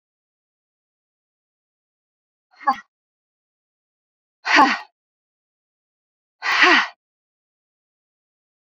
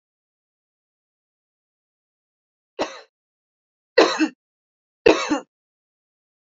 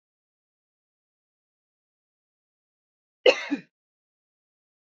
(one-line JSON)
{"exhalation_length": "8.7 s", "exhalation_amplitude": 28516, "exhalation_signal_mean_std_ratio": 0.23, "three_cough_length": "6.5 s", "three_cough_amplitude": 32768, "three_cough_signal_mean_std_ratio": 0.22, "cough_length": "4.9 s", "cough_amplitude": 21806, "cough_signal_mean_std_ratio": 0.13, "survey_phase": "beta (2021-08-13 to 2022-03-07)", "age": "18-44", "gender": "Female", "wearing_mask": "No", "symptom_none": true, "smoker_status": "Never smoked", "respiratory_condition_asthma": false, "respiratory_condition_other": false, "recruitment_source": "REACT", "submission_delay": "1 day", "covid_test_result": "Negative", "covid_test_method": "RT-qPCR", "influenza_a_test_result": "Negative", "influenza_b_test_result": "Negative"}